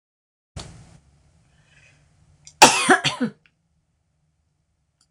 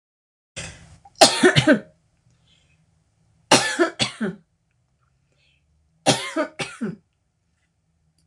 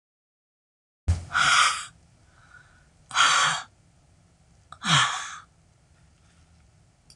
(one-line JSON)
{"cough_length": "5.1 s", "cough_amplitude": 26028, "cough_signal_mean_std_ratio": 0.23, "three_cough_length": "8.3 s", "three_cough_amplitude": 26028, "three_cough_signal_mean_std_ratio": 0.31, "exhalation_length": "7.2 s", "exhalation_amplitude": 15459, "exhalation_signal_mean_std_ratio": 0.38, "survey_phase": "beta (2021-08-13 to 2022-03-07)", "age": "65+", "gender": "Female", "wearing_mask": "No", "symptom_none": true, "symptom_onset": "6 days", "smoker_status": "Ex-smoker", "respiratory_condition_asthma": false, "respiratory_condition_other": false, "recruitment_source": "Test and Trace", "submission_delay": "1 day", "covid_test_result": "Positive", "covid_test_method": "RT-qPCR", "covid_ct_value": 23.4, "covid_ct_gene": "ORF1ab gene", "covid_ct_mean": 23.9, "covid_viral_load": "15000 copies/ml", "covid_viral_load_category": "Low viral load (10K-1M copies/ml)"}